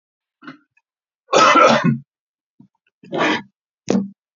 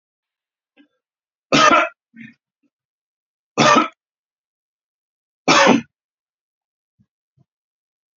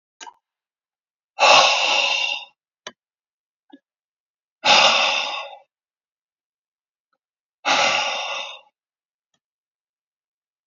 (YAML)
cough_length: 4.4 s
cough_amplitude: 30885
cough_signal_mean_std_ratio: 0.4
three_cough_length: 8.2 s
three_cough_amplitude: 32492
three_cough_signal_mean_std_ratio: 0.28
exhalation_length: 10.7 s
exhalation_amplitude: 30384
exhalation_signal_mean_std_ratio: 0.37
survey_phase: beta (2021-08-13 to 2022-03-07)
age: 65+
gender: Male
wearing_mask: 'No'
symptom_none: true
smoker_status: Never smoked
respiratory_condition_asthma: false
respiratory_condition_other: false
recruitment_source: Test and Trace
submission_delay: 1 day
covid_test_result: Negative
covid_test_method: LFT